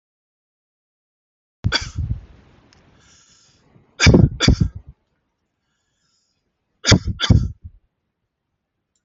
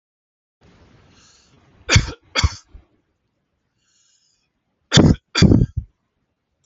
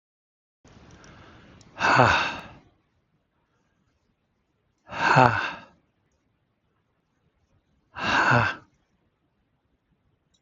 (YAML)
three_cough_length: 9.0 s
three_cough_amplitude: 31482
three_cough_signal_mean_std_ratio: 0.28
cough_length: 6.7 s
cough_amplitude: 31325
cough_signal_mean_std_ratio: 0.28
exhalation_length: 10.4 s
exhalation_amplitude: 32767
exhalation_signal_mean_std_ratio: 0.3
survey_phase: alpha (2021-03-01 to 2021-08-12)
age: 45-64
gender: Male
wearing_mask: 'No'
symptom_none: true
smoker_status: Never smoked
respiratory_condition_asthma: false
respiratory_condition_other: false
recruitment_source: REACT
submission_delay: 1 day
covid_test_result: Negative
covid_test_method: RT-qPCR